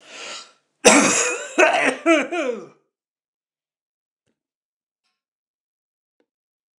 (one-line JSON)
{"cough_length": "6.8 s", "cough_amplitude": 29204, "cough_signal_mean_std_ratio": 0.34, "survey_phase": "beta (2021-08-13 to 2022-03-07)", "age": "65+", "gender": "Male", "wearing_mask": "No", "symptom_none": true, "smoker_status": "Never smoked", "respiratory_condition_asthma": false, "respiratory_condition_other": false, "recruitment_source": "REACT", "submission_delay": "1 day", "covid_test_result": "Negative", "covid_test_method": "RT-qPCR", "influenza_a_test_result": "Negative", "influenza_b_test_result": "Negative"}